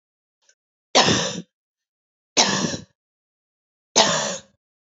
{"three_cough_length": "4.9 s", "three_cough_amplitude": 31853, "three_cough_signal_mean_std_ratio": 0.37, "survey_phase": "beta (2021-08-13 to 2022-03-07)", "age": "18-44", "gender": "Female", "wearing_mask": "No", "symptom_cough_any": true, "symptom_runny_or_blocked_nose": true, "symptom_fatigue": true, "symptom_headache": true, "symptom_change_to_sense_of_smell_or_taste": true, "symptom_loss_of_taste": true, "smoker_status": "Never smoked", "respiratory_condition_asthma": false, "respiratory_condition_other": false, "recruitment_source": "Test and Trace", "submission_delay": "2 days", "covid_test_result": "Positive", "covid_test_method": "RT-qPCR"}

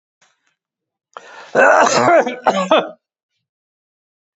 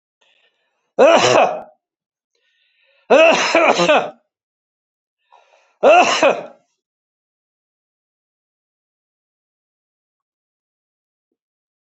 {"cough_length": "4.4 s", "cough_amplitude": 32767, "cough_signal_mean_std_ratio": 0.42, "three_cough_length": "11.9 s", "three_cough_amplitude": 32261, "three_cough_signal_mean_std_ratio": 0.33, "survey_phase": "beta (2021-08-13 to 2022-03-07)", "age": "65+", "gender": "Male", "wearing_mask": "No", "symptom_none": true, "smoker_status": "Never smoked", "respiratory_condition_asthma": false, "respiratory_condition_other": false, "recruitment_source": "Test and Trace", "submission_delay": "1 day", "covid_test_result": "Negative", "covid_test_method": "RT-qPCR"}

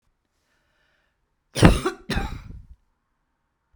{"cough_length": "3.8 s", "cough_amplitude": 32768, "cough_signal_mean_std_ratio": 0.25, "survey_phase": "beta (2021-08-13 to 2022-03-07)", "age": "65+", "gender": "Female", "wearing_mask": "No", "symptom_none": true, "smoker_status": "Never smoked", "respiratory_condition_asthma": false, "respiratory_condition_other": false, "recruitment_source": "REACT", "submission_delay": "1 day", "covid_test_result": "Negative", "covid_test_method": "RT-qPCR", "influenza_a_test_result": "Negative", "influenza_b_test_result": "Negative"}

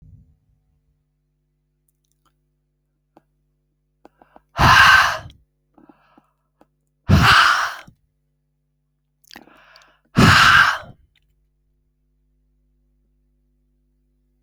{"exhalation_length": "14.4 s", "exhalation_amplitude": 32768, "exhalation_signal_mean_std_ratio": 0.29, "survey_phase": "alpha (2021-03-01 to 2021-08-12)", "age": "65+", "gender": "Male", "wearing_mask": "No", "symptom_cough_any": true, "symptom_shortness_of_breath": true, "smoker_status": "Ex-smoker", "respiratory_condition_asthma": false, "respiratory_condition_other": false, "recruitment_source": "REACT", "submission_delay": "22 days", "covid_test_result": "Negative", "covid_test_method": "RT-qPCR"}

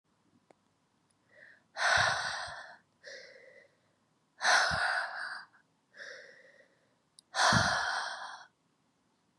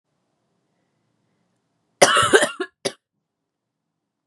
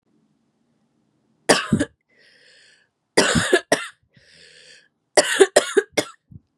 {"exhalation_length": "9.4 s", "exhalation_amplitude": 7892, "exhalation_signal_mean_std_ratio": 0.43, "cough_length": "4.3 s", "cough_amplitude": 32767, "cough_signal_mean_std_ratio": 0.26, "three_cough_length": "6.6 s", "three_cough_amplitude": 32767, "three_cough_signal_mean_std_ratio": 0.32, "survey_phase": "beta (2021-08-13 to 2022-03-07)", "age": "18-44", "gender": "Female", "wearing_mask": "No", "symptom_cough_any": true, "symptom_new_continuous_cough": true, "symptom_runny_or_blocked_nose": true, "symptom_sore_throat": true, "symptom_fatigue": true, "symptom_headache": true, "symptom_onset": "6 days", "smoker_status": "Never smoked", "respiratory_condition_asthma": false, "respiratory_condition_other": false, "recruitment_source": "Test and Trace", "submission_delay": "1 day", "covid_test_result": "Positive", "covid_test_method": "RT-qPCR", "covid_ct_value": 13.5, "covid_ct_gene": "ORF1ab gene"}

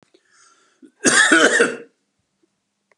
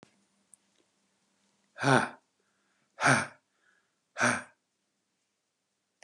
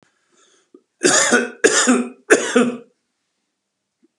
{"cough_length": "3.0 s", "cough_amplitude": 32460, "cough_signal_mean_std_ratio": 0.39, "exhalation_length": "6.0 s", "exhalation_amplitude": 12195, "exhalation_signal_mean_std_ratio": 0.26, "three_cough_length": "4.2 s", "three_cough_amplitude": 32694, "three_cough_signal_mean_std_ratio": 0.45, "survey_phase": "beta (2021-08-13 to 2022-03-07)", "age": "65+", "gender": "Male", "wearing_mask": "No", "symptom_runny_or_blocked_nose": true, "smoker_status": "Never smoked", "respiratory_condition_asthma": false, "respiratory_condition_other": false, "recruitment_source": "Test and Trace", "submission_delay": "4 days", "covid_test_result": "Negative", "covid_test_method": "LFT"}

